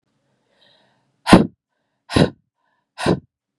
{"exhalation_length": "3.6 s", "exhalation_amplitude": 32768, "exhalation_signal_mean_std_ratio": 0.25, "survey_phase": "beta (2021-08-13 to 2022-03-07)", "age": "18-44", "gender": "Female", "wearing_mask": "No", "symptom_cough_any": true, "symptom_runny_or_blocked_nose": true, "symptom_onset": "2 days", "smoker_status": "Never smoked", "respiratory_condition_asthma": false, "respiratory_condition_other": false, "recruitment_source": "Test and Trace", "submission_delay": "1 day", "covid_test_result": "Positive", "covid_test_method": "LAMP"}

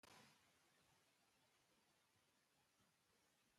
{"cough_length": "3.6 s", "cough_amplitude": 58, "cough_signal_mean_std_ratio": 0.74, "survey_phase": "beta (2021-08-13 to 2022-03-07)", "age": "65+", "gender": "Male", "wearing_mask": "No", "symptom_none": true, "smoker_status": "Never smoked", "respiratory_condition_asthma": false, "respiratory_condition_other": false, "recruitment_source": "REACT", "submission_delay": "3 days", "covid_test_result": "Negative", "covid_test_method": "RT-qPCR"}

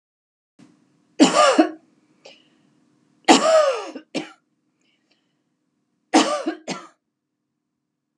{"three_cough_length": "8.2 s", "three_cough_amplitude": 32768, "three_cough_signal_mean_std_ratio": 0.32, "survey_phase": "beta (2021-08-13 to 2022-03-07)", "age": "45-64", "gender": "Female", "wearing_mask": "No", "symptom_none": true, "smoker_status": "Never smoked", "respiratory_condition_asthma": false, "respiratory_condition_other": false, "recruitment_source": "REACT", "submission_delay": "1 day", "covid_test_result": "Negative", "covid_test_method": "RT-qPCR"}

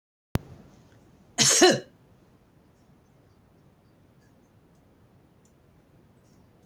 {"cough_length": "6.7 s", "cough_amplitude": 16160, "cough_signal_mean_std_ratio": 0.22, "survey_phase": "beta (2021-08-13 to 2022-03-07)", "age": "65+", "gender": "Female", "wearing_mask": "No", "symptom_none": true, "smoker_status": "Ex-smoker", "respiratory_condition_asthma": false, "respiratory_condition_other": false, "recruitment_source": "REACT", "submission_delay": "2 days", "covid_test_result": "Negative", "covid_test_method": "RT-qPCR", "influenza_a_test_result": "Negative", "influenza_b_test_result": "Negative"}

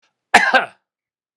{"cough_length": "1.4 s", "cough_amplitude": 32768, "cough_signal_mean_std_ratio": 0.33, "survey_phase": "beta (2021-08-13 to 2022-03-07)", "age": "65+", "gender": "Male", "wearing_mask": "No", "symptom_none": true, "smoker_status": "Ex-smoker", "respiratory_condition_asthma": false, "respiratory_condition_other": false, "recruitment_source": "REACT", "submission_delay": "2 days", "covid_test_result": "Negative", "covid_test_method": "RT-qPCR", "influenza_a_test_result": "Negative", "influenza_b_test_result": "Negative"}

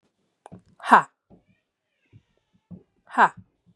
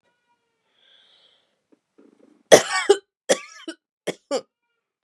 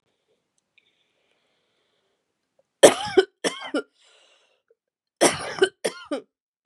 {"exhalation_length": "3.8 s", "exhalation_amplitude": 31533, "exhalation_signal_mean_std_ratio": 0.2, "three_cough_length": "5.0 s", "three_cough_amplitude": 32768, "three_cough_signal_mean_std_ratio": 0.21, "cough_length": "6.7 s", "cough_amplitude": 32768, "cough_signal_mean_std_ratio": 0.23, "survey_phase": "beta (2021-08-13 to 2022-03-07)", "age": "18-44", "gender": "Female", "wearing_mask": "No", "symptom_cough_any": true, "symptom_runny_or_blocked_nose": true, "symptom_shortness_of_breath": true, "symptom_sore_throat": true, "symptom_fatigue": true, "symptom_headache": true, "symptom_change_to_sense_of_smell_or_taste": true, "smoker_status": "Never smoked", "recruitment_source": "Test and Trace", "submission_delay": "1 day", "covid_test_result": "Positive", "covid_test_method": "LFT"}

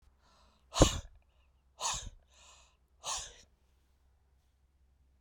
{"exhalation_length": "5.2 s", "exhalation_amplitude": 11676, "exhalation_signal_mean_std_ratio": 0.23, "survey_phase": "beta (2021-08-13 to 2022-03-07)", "age": "45-64", "gender": "Female", "wearing_mask": "No", "symptom_none": true, "smoker_status": "Ex-smoker", "respiratory_condition_asthma": false, "respiratory_condition_other": true, "recruitment_source": "REACT", "submission_delay": "1 day", "covid_test_result": "Negative", "covid_test_method": "RT-qPCR"}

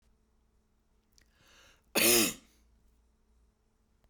{"three_cough_length": "4.1 s", "three_cough_amplitude": 8631, "three_cough_signal_mean_std_ratio": 0.25, "survey_phase": "beta (2021-08-13 to 2022-03-07)", "age": "65+", "gender": "Female", "wearing_mask": "No", "symptom_none": true, "smoker_status": "Never smoked", "respiratory_condition_asthma": false, "respiratory_condition_other": false, "recruitment_source": "REACT", "submission_delay": "1 day", "covid_test_result": "Negative", "covid_test_method": "RT-qPCR"}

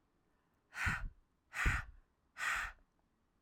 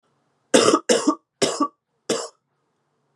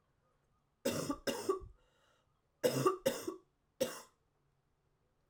{"exhalation_length": "3.4 s", "exhalation_amplitude": 2807, "exhalation_signal_mean_std_ratio": 0.43, "cough_length": "3.2 s", "cough_amplitude": 30611, "cough_signal_mean_std_ratio": 0.39, "three_cough_length": "5.3 s", "three_cough_amplitude": 4233, "three_cough_signal_mean_std_ratio": 0.38, "survey_phase": "alpha (2021-03-01 to 2021-08-12)", "age": "45-64", "gender": "Female", "wearing_mask": "No", "symptom_cough_any": true, "symptom_change_to_sense_of_smell_or_taste": true, "symptom_onset": "2 days", "smoker_status": "Never smoked", "respiratory_condition_asthma": false, "respiratory_condition_other": false, "recruitment_source": "Test and Trace", "submission_delay": "1 day", "covid_test_result": "Positive", "covid_test_method": "RT-qPCR", "covid_ct_value": 17.0, "covid_ct_gene": "ORF1ab gene", "covid_ct_mean": 18.0, "covid_viral_load": "1300000 copies/ml", "covid_viral_load_category": "High viral load (>1M copies/ml)"}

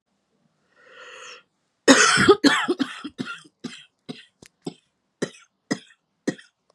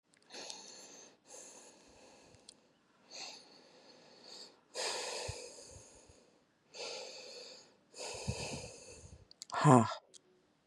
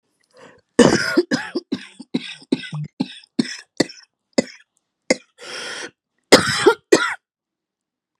{"three_cough_length": "6.7 s", "three_cough_amplitude": 32756, "three_cough_signal_mean_std_ratio": 0.31, "exhalation_length": "10.7 s", "exhalation_amplitude": 11638, "exhalation_signal_mean_std_ratio": 0.29, "cough_length": "8.2 s", "cough_amplitude": 32768, "cough_signal_mean_std_ratio": 0.33, "survey_phase": "beta (2021-08-13 to 2022-03-07)", "age": "18-44", "gender": "Female", "wearing_mask": "No", "symptom_sore_throat": true, "symptom_headache": true, "symptom_loss_of_taste": true, "symptom_onset": "4 days", "smoker_status": "Current smoker (11 or more cigarettes per day)", "respiratory_condition_asthma": false, "respiratory_condition_other": false, "recruitment_source": "Test and Trace", "submission_delay": "1 day", "covid_test_result": "Positive", "covid_test_method": "RT-qPCR", "covid_ct_value": 21.5, "covid_ct_gene": "ORF1ab gene", "covid_ct_mean": 21.9, "covid_viral_load": "64000 copies/ml", "covid_viral_load_category": "Low viral load (10K-1M copies/ml)"}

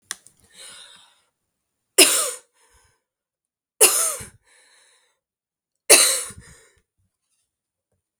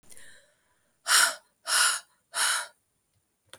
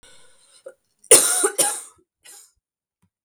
{"three_cough_length": "8.2 s", "three_cough_amplitude": 32768, "three_cough_signal_mean_std_ratio": 0.25, "exhalation_length": "3.6 s", "exhalation_amplitude": 13401, "exhalation_signal_mean_std_ratio": 0.4, "cough_length": "3.2 s", "cough_amplitude": 32768, "cough_signal_mean_std_ratio": 0.3, "survey_phase": "beta (2021-08-13 to 2022-03-07)", "age": "18-44", "gender": "Female", "wearing_mask": "No", "symptom_cough_any": true, "symptom_runny_or_blocked_nose": true, "symptom_shortness_of_breath": true, "symptom_sore_throat": true, "symptom_fatigue": true, "symptom_headache": true, "symptom_change_to_sense_of_smell_or_taste": true, "symptom_loss_of_taste": true, "symptom_onset": "3 days", "smoker_status": "Never smoked", "respiratory_condition_asthma": false, "respiratory_condition_other": false, "recruitment_source": "Test and Trace", "submission_delay": "1 day", "covid_test_result": "Positive", "covid_test_method": "RT-qPCR"}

